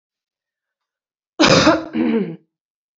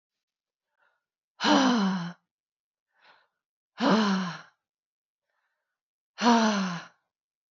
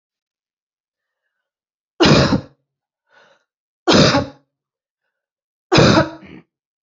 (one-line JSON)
{"cough_length": "3.0 s", "cough_amplitude": 28270, "cough_signal_mean_std_ratio": 0.41, "exhalation_length": "7.5 s", "exhalation_amplitude": 14500, "exhalation_signal_mean_std_ratio": 0.39, "three_cough_length": "6.8 s", "three_cough_amplitude": 31831, "three_cough_signal_mean_std_ratio": 0.33, "survey_phase": "alpha (2021-03-01 to 2021-08-12)", "age": "18-44", "gender": "Female", "wearing_mask": "No", "symptom_cough_any": true, "symptom_fatigue": true, "symptom_fever_high_temperature": true, "symptom_headache": true, "symptom_change_to_sense_of_smell_or_taste": true, "symptom_onset": "2 days", "smoker_status": "Ex-smoker", "respiratory_condition_asthma": false, "respiratory_condition_other": false, "recruitment_source": "Test and Trace", "submission_delay": "2 days", "covid_test_result": "Positive", "covid_test_method": "RT-qPCR", "covid_ct_value": 25.6, "covid_ct_gene": "ORF1ab gene", "covid_ct_mean": 26.1, "covid_viral_load": "2800 copies/ml", "covid_viral_load_category": "Minimal viral load (< 10K copies/ml)"}